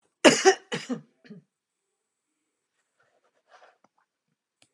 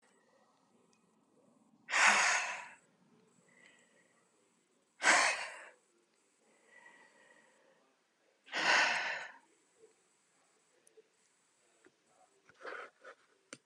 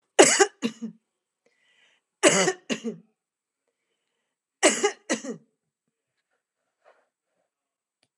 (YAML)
cough_length: 4.7 s
cough_amplitude: 26333
cough_signal_mean_std_ratio: 0.2
exhalation_length: 13.7 s
exhalation_amplitude: 8011
exhalation_signal_mean_std_ratio: 0.3
three_cough_length: 8.2 s
three_cough_amplitude: 29983
three_cough_signal_mean_std_ratio: 0.27
survey_phase: beta (2021-08-13 to 2022-03-07)
age: 65+
gender: Female
wearing_mask: 'No'
symptom_none: true
smoker_status: Ex-smoker
respiratory_condition_asthma: true
respiratory_condition_other: false
recruitment_source: REACT
submission_delay: 2 days
covid_test_result: Negative
covid_test_method: RT-qPCR
influenza_a_test_result: Negative
influenza_b_test_result: Negative